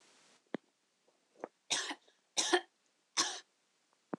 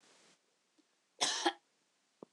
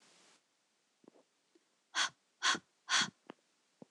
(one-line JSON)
{"three_cough_length": "4.2 s", "three_cough_amplitude": 6611, "three_cough_signal_mean_std_ratio": 0.3, "cough_length": "2.3 s", "cough_amplitude": 4725, "cough_signal_mean_std_ratio": 0.29, "exhalation_length": "3.9 s", "exhalation_amplitude": 4893, "exhalation_signal_mean_std_ratio": 0.28, "survey_phase": "beta (2021-08-13 to 2022-03-07)", "age": "18-44", "gender": "Female", "wearing_mask": "No", "symptom_none": true, "smoker_status": "Never smoked", "respiratory_condition_asthma": false, "respiratory_condition_other": false, "recruitment_source": "REACT", "submission_delay": "3 days", "covid_test_result": "Negative", "covid_test_method": "RT-qPCR", "influenza_a_test_result": "Negative", "influenza_b_test_result": "Negative"}